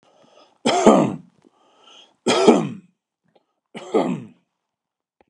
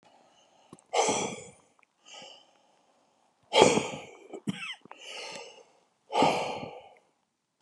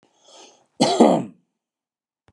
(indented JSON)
{
  "three_cough_length": "5.3 s",
  "three_cough_amplitude": 32768,
  "three_cough_signal_mean_std_ratio": 0.36,
  "exhalation_length": "7.6 s",
  "exhalation_amplitude": 26975,
  "exhalation_signal_mean_std_ratio": 0.35,
  "cough_length": "2.3 s",
  "cough_amplitude": 31026,
  "cough_signal_mean_std_ratio": 0.33,
  "survey_phase": "beta (2021-08-13 to 2022-03-07)",
  "age": "65+",
  "gender": "Male",
  "wearing_mask": "No",
  "symptom_none": true,
  "smoker_status": "Ex-smoker",
  "respiratory_condition_asthma": false,
  "respiratory_condition_other": false,
  "recruitment_source": "REACT",
  "submission_delay": "3 days",
  "covid_test_result": "Negative",
  "covid_test_method": "RT-qPCR"
}